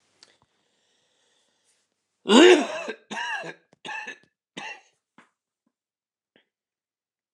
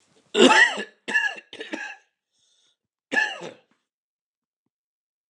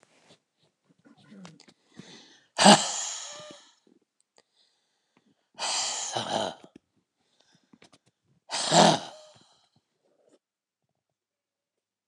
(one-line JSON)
{"three_cough_length": "7.3 s", "three_cough_amplitude": 26878, "three_cough_signal_mean_std_ratio": 0.23, "cough_length": "5.3 s", "cough_amplitude": 27660, "cough_signal_mean_std_ratio": 0.32, "exhalation_length": "12.1 s", "exhalation_amplitude": 25999, "exhalation_signal_mean_std_ratio": 0.25, "survey_phase": "alpha (2021-03-01 to 2021-08-12)", "age": "65+", "gender": "Male", "wearing_mask": "No", "symptom_none": true, "smoker_status": "Ex-smoker", "respiratory_condition_asthma": false, "respiratory_condition_other": false, "recruitment_source": "REACT", "submission_delay": "2 days", "covid_test_result": "Negative", "covid_test_method": "RT-qPCR"}